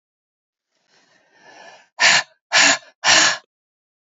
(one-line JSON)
{"exhalation_length": "4.0 s", "exhalation_amplitude": 29021, "exhalation_signal_mean_std_ratio": 0.37, "survey_phase": "beta (2021-08-13 to 2022-03-07)", "age": "18-44", "gender": "Female", "wearing_mask": "No", "symptom_cough_any": true, "symptom_runny_or_blocked_nose": true, "symptom_sore_throat": true, "symptom_fatigue": true, "symptom_fever_high_temperature": true, "symptom_headache": true, "symptom_onset": "3 days", "smoker_status": "Ex-smoker", "respiratory_condition_asthma": false, "respiratory_condition_other": false, "recruitment_source": "Test and Trace", "submission_delay": "1 day", "covid_test_result": "Positive", "covid_test_method": "RT-qPCR", "covid_ct_value": 16.9, "covid_ct_gene": "N gene"}